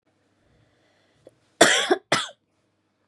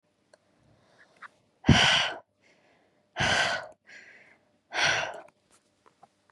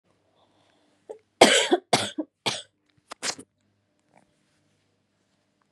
{"cough_length": "3.1 s", "cough_amplitude": 32365, "cough_signal_mean_std_ratio": 0.28, "exhalation_length": "6.3 s", "exhalation_amplitude": 17876, "exhalation_signal_mean_std_ratio": 0.35, "three_cough_length": "5.7 s", "three_cough_amplitude": 32768, "three_cough_signal_mean_std_ratio": 0.24, "survey_phase": "beta (2021-08-13 to 2022-03-07)", "age": "18-44", "gender": "Female", "wearing_mask": "No", "symptom_cough_any": true, "symptom_fatigue": true, "symptom_onset": "4 days", "smoker_status": "Never smoked", "respiratory_condition_asthma": false, "respiratory_condition_other": false, "recruitment_source": "Test and Trace", "submission_delay": "1 day", "covid_test_result": "Positive", "covid_test_method": "RT-qPCR", "covid_ct_value": 22.5, "covid_ct_gene": "N gene"}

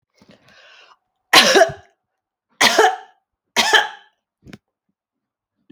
{"cough_length": "5.7 s", "cough_amplitude": 32767, "cough_signal_mean_std_ratio": 0.33, "survey_phase": "alpha (2021-03-01 to 2021-08-12)", "age": "45-64", "gender": "Female", "wearing_mask": "No", "symptom_none": true, "smoker_status": "Never smoked", "respiratory_condition_asthma": false, "respiratory_condition_other": false, "recruitment_source": "REACT", "submission_delay": "4 days", "covid_test_method": "RT-qPCR"}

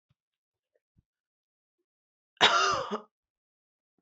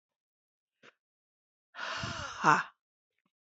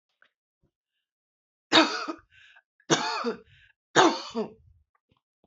{"cough_length": "4.0 s", "cough_amplitude": 20019, "cough_signal_mean_std_ratio": 0.26, "exhalation_length": "3.4 s", "exhalation_amplitude": 12668, "exhalation_signal_mean_std_ratio": 0.27, "three_cough_length": "5.5 s", "three_cough_amplitude": 25425, "three_cough_signal_mean_std_ratio": 0.31, "survey_phase": "beta (2021-08-13 to 2022-03-07)", "age": "45-64", "gender": "Female", "wearing_mask": "No", "symptom_none": true, "smoker_status": "Never smoked", "respiratory_condition_asthma": false, "respiratory_condition_other": false, "recruitment_source": "Test and Trace", "submission_delay": "2 days", "covid_test_result": "Positive", "covid_test_method": "LFT"}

